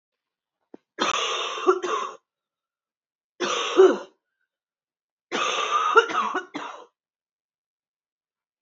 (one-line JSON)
{"three_cough_length": "8.6 s", "three_cough_amplitude": 25590, "three_cough_signal_mean_std_ratio": 0.39, "survey_phase": "beta (2021-08-13 to 2022-03-07)", "age": "45-64", "gender": "Female", "wearing_mask": "No", "symptom_cough_any": true, "symptom_runny_or_blocked_nose": true, "smoker_status": "Never smoked", "respiratory_condition_asthma": false, "respiratory_condition_other": false, "recruitment_source": "Test and Trace", "submission_delay": "1 day", "covid_test_result": "Positive", "covid_test_method": "RT-qPCR", "covid_ct_value": 12.8, "covid_ct_gene": "ORF1ab gene", "covid_ct_mean": 13.3, "covid_viral_load": "44000000 copies/ml", "covid_viral_load_category": "High viral load (>1M copies/ml)"}